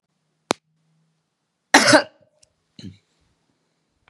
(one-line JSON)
{"cough_length": "4.1 s", "cough_amplitude": 32768, "cough_signal_mean_std_ratio": 0.21, "survey_phase": "beta (2021-08-13 to 2022-03-07)", "age": "65+", "gender": "Female", "wearing_mask": "No", "symptom_cough_any": true, "symptom_runny_or_blocked_nose": true, "symptom_sore_throat": true, "symptom_fatigue": true, "symptom_onset": "3 days", "smoker_status": "Never smoked", "respiratory_condition_asthma": false, "respiratory_condition_other": false, "recruitment_source": "Test and Trace", "submission_delay": "1 day", "covid_test_result": "Positive", "covid_test_method": "ePCR"}